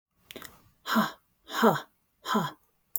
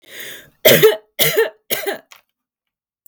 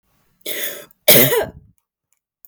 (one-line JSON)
{"exhalation_length": "3.0 s", "exhalation_amplitude": 13579, "exhalation_signal_mean_std_ratio": 0.39, "three_cough_length": "3.1 s", "three_cough_amplitude": 32768, "three_cough_signal_mean_std_ratio": 0.4, "cough_length": "2.5 s", "cough_amplitude": 32768, "cough_signal_mean_std_ratio": 0.36, "survey_phase": "beta (2021-08-13 to 2022-03-07)", "age": "18-44", "gender": "Female", "wearing_mask": "No", "symptom_cough_any": true, "symptom_fatigue": true, "symptom_onset": "5 days", "smoker_status": "Never smoked", "respiratory_condition_asthma": false, "respiratory_condition_other": false, "recruitment_source": "REACT", "submission_delay": "1 day", "covid_test_result": "Negative", "covid_test_method": "RT-qPCR"}